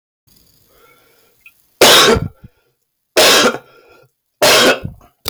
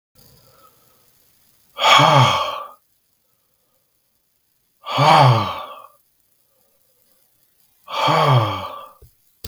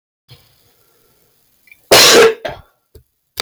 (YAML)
three_cough_length: 5.3 s
three_cough_amplitude: 32768
three_cough_signal_mean_std_ratio: 0.45
exhalation_length: 9.5 s
exhalation_amplitude: 32756
exhalation_signal_mean_std_ratio: 0.39
cough_length: 3.4 s
cough_amplitude: 32766
cough_signal_mean_std_ratio: 0.35
survey_phase: beta (2021-08-13 to 2022-03-07)
age: 18-44
gender: Male
wearing_mask: 'No'
symptom_cough_any: true
symptom_new_continuous_cough: true
symptom_sore_throat: true
symptom_onset: 3 days
smoker_status: Never smoked
respiratory_condition_asthma: false
respiratory_condition_other: false
recruitment_source: Test and Trace
submission_delay: 2 days
covid_test_result: Positive
covid_test_method: ePCR